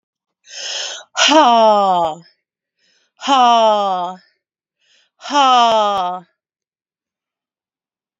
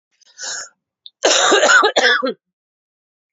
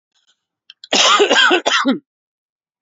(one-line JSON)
{"exhalation_length": "8.2 s", "exhalation_amplitude": 31149, "exhalation_signal_mean_std_ratio": 0.5, "three_cough_length": "3.3 s", "three_cough_amplitude": 29865, "three_cough_signal_mean_std_ratio": 0.49, "cough_length": "2.8 s", "cough_amplitude": 29826, "cough_signal_mean_std_ratio": 0.51, "survey_phase": "beta (2021-08-13 to 2022-03-07)", "age": "45-64", "gender": "Female", "wearing_mask": "No", "symptom_cough_any": true, "symptom_runny_or_blocked_nose": true, "symptom_fatigue": true, "symptom_headache": true, "smoker_status": "Never smoked", "respiratory_condition_asthma": false, "respiratory_condition_other": false, "recruitment_source": "Test and Trace", "submission_delay": "2 days", "covid_test_result": "Positive", "covid_test_method": "RT-qPCR", "covid_ct_value": 31.0, "covid_ct_gene": "ORF1ab gene", "covid_ct_mean": 32.8, "covid_viral_load": "18 copies/ml", "covid_viral_load_category": "Minimal viral load (< 10K copies/ml)"}